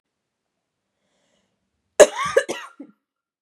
{"cough_length": "3.4 s", "cough_amplitude": 32768, "cough_signal_mean_std_ratio": 0.19, "survey_phase": "beta (2021-08-13 to 2022-03-07)", "age": "18-44", "gender": "Female", "wearing_mask": "No", "symptom_change_to_sense_of_smell_or_taste": true, "symptom_onset": "11 days", "smoker_status": "Never smoked", "respiratory_condition_asthma": false, "respiratory_condition_other": false, "recruitment_source": "REACT", "submission_delay": "1 day", "covid_test_result": "Negative", "covid_test_method": "RT-qPCR", "covid_ct_value": 39.0, "covid_ct_gene": "N gene", "influenza_a_test_result": "Negative", "influenza_b_test_result": "Negative"}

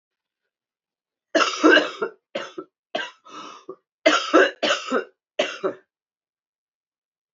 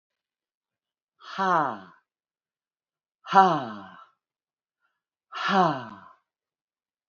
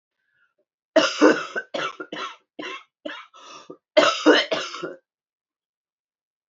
{"three_cough_length": "7.3 s", "three_cough_amplitude": 24479, "three_cough_signal_mean_std_ratio": 0.36, "exhalation_length": "7.1 s", "exhalation_amplitude": 24615, "exhalation_signal_mean_std_ratio": 0.3, "cough_length": "6.5 s", "cough_amplitude": 23356, "cough_signal_mean_std_ratio": 0.35, "survey_phase": "beta (2021-08-13 to 2022-03-07)", "age": "65+", "gender": "Female", "wearing_mask": "No", "symptom_cough_any": true, "symptom_new_continuous_cough": true, "symptom_runny_or_blocked_nose": true, "symptom_fatigue": true, "symptom_change_to_sense_of_smell_or_taste": true, "symptom_loss_of_taste": true, "symptom_onset": "5 days", "smoker_status": "Never smoked", "respiratory_condition_asthma": false, "respiratory_condition_other": false, "recruitment_source": "Test and Trace", "submission_delay": "2 days", "covid_test_result": "Positive", "covid_test_method": "RT-qPCR"}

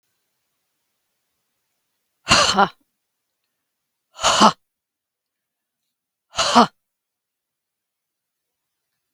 {"exhalation_length": "9.1 s", "exhalation_amplitude": 32768, "exhalation_signal_mean_std_ratio": 0.23, "survey_phase": "beta (2021-08-13 to 2022-03-07)", "age": "45-64", "gender": "Female", "wearing_mask": "No", "symptom_runny_or_blocked_nose": true, "symptom_fatigue": true, "symptom_onset": "11 days", "smoker_status": "Never smoked", "respiratory_condition_asthma": true, "respiratory_condition_other": false, "recruitment_source": "REACT", "submission_delay": "5 days", "covid_test_result": "Negative", "covid_test_method": "RT-qPCR", "influenza_a_test_result": "Negative", "influenza_b_test_result": "Negative"}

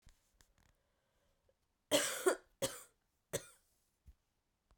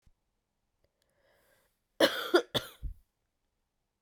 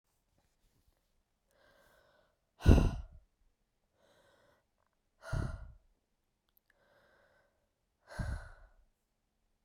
{"three_cough_length": "4.8 s", "three_cough_amplitude": 4411, "three_cough_signal_mean_std_ratio": 0.26, "cough_length": "4.0 s", "cough_amplitude": 9244, "cough_signal_mean_std_ratio": 0.24, "exhalation_length": "9.6 s", "exhalation_amplitude": 12099, "exhalation_signal_mean_std_ratio": 0.19, "survey_phase": "beta (2021-08-13 to 2022-03-07)", "age": "18-44", "gender": "Female", "wearing_mask": "No", "symptom_cough_any": true, "symptom_headache": true, "symptom_loss_of_taste": true, "symptom_other": true, "symptom_onset": "3 days", "smoker_status": "Ex-smoker", "respiratory_condition_asthma": false, "respiratory_condition_other": false, "recruitment_source": "Test and Trace", "submission_delay": "2 days", "covid_test_result": "Positive", "covid_test_method": "RT-qPCR", "covid_ct_value": 22.7, "covid_ct_gene": "ORF1ab gene"}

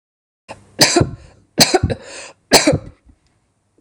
{"three_cough_length": "3.8 s", "three_cough_amplitude": 26028, "three_cough_signal_mean_std_ratio": 0.38, "survey_phase": "beta (2021-08-13 to 2022-03-07)", "age": "45-64", "gender": "Female", "wearing_mask": "No", "symptom_none": true, "smoker_status": "Ex-smoker", "respiratory_condition_asthma": false, "respiratory_condition_other": false, "recruitment_source": "REACT", "submission_delay": "3 days", "covid_test_result": "Negative", "covid_test_method": "RT-qPCR", "influenza_a_test_result": "Unknown/Void", "influenza_b_test_result": "Unknown/Void"}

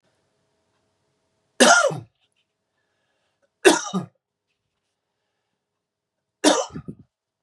{"three_cough_length": "7.4 s", "three_cough_amplitude": 32391, "three_cough_signal_mean_std_ratio": 0.25, "survey_phase": "beta (2021-08-13 to 2022-03-07)", "age": "45-64", "gender": "Male", "wearing_mask": "No", "symptom_cough_any": true, "symptom_runny_or_blocked_nose": true, "symptom_sore_throat": true, "symptom_abdominal_pain": true, "symptom_fatigue": true, "symptom_change_to_sense_of_smell_or_taste": true, "smoker_status": "Never smoked", "respiratory_condition_asthma": true, "respiratory_condition_other": false, "recruitment_source": "Test and Trace", "submission_delay": "2 days", "covid_test_result": "Positive", "covid_test_method": "LFT"}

